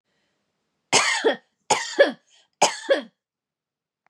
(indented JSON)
{
  "three_cough_length": "4.1 s",
  "three_cough_amplitude": 24354,
  "three_cough_signal_mean_std_ratio": 0.36,
  "survey_phase": "beta (2021-08-13 to 2022-03-07)",
  "age": "45-64",
  "gender": "Female",
  "wearing_mask": "No",
  "symptom_cough_any": true,
  "symptom_runny_or_blocked_nose": true,
  "symptom_fatigue": true,
  "symptom_headache": true,
  "smoker_status": "Ex-smoker",
  "respiratory_condition_asthma": false,
  "respiratory_condition_other": false,
  "recruitment_source": "Test and Trace",
  "submission_delay": "2 days",
  "covid_test_result": "Positive",
  "covid_test_method": "LFT"
}